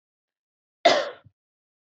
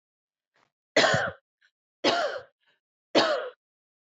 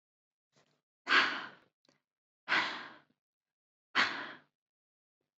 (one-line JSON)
{"cough_length": "1.9 s", "cough_amplitude": 18277, "cough_signal_mean_std_ratio": 0.26, "three_cough_length": "4.2 s", "three_cough_amplitude": 13830, "three_cough_signal_mean_std_ratio": 0.38, "exhalation_length": "5.4 s", "exhalation_amplitude": 6658, "exhalation_signal_mean_std_ratio": 0.31, "survey_phase": "beta (2021-08-13 to 2022-03-07)", "age": "18-44", "gender": "Female", "wearing_mask": "No", "symptom_none": true, "smoker_status": "Ex-smoker", "respiratory_condition_asthma": false, "respiratory_condition_other": false, "recruitment_source": "REACT", "submission_delay": "0 days", "covid_test_result": "Negative", "covid_test_method": "RT-qPCR"}